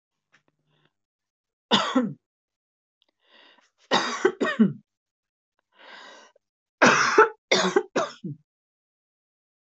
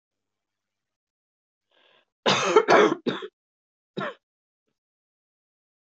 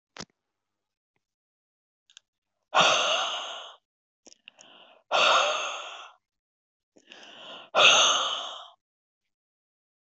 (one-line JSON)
{"three_cough_length": "9.7 s", "three_cough_amplitude": 25026, "three_cough_signal_mean_std_ratio": 0.33, "cough_length": "6.0 s", "cough_amplitude": 21806, "cough_signal_mean_std_ratio": 0.27, "exhalation_length": "10.1 s", "exhalation_amplitude": 17396, "exhalation_signal_mean_std_ratio": 0.36, "survey_phase": "beta (2021-08-13 to 2022-03-07)", "age": "45-64", "gender": "Female", "wearing_mask": "No", "symptom_cough_any": true, "symptom_runny_or_blocked_nose": true, "symptom_sore_throat": true, "symptom_fatigue": true, "symptom_fever_high_temperature": true, "symptom_headache": true, "smoker_status": "Never smoked", "respiratory_condition_asthma": false, "respiratory_condition_other": false, "recruitment_source": "Test and Trace", "submission_delay": "2 days", "covid_test_result": "Positive", "covid_test_method": "RT-qPCR", "covid_ct_value": 21.8, "covid_ct_gene": "ORF1ab gene", "covid_ct_mean": 23.2, "covid_viral_load": "24000 copies/ml", "covid_viral_load_category": "Low viral load (10K-1M copies/ml)"}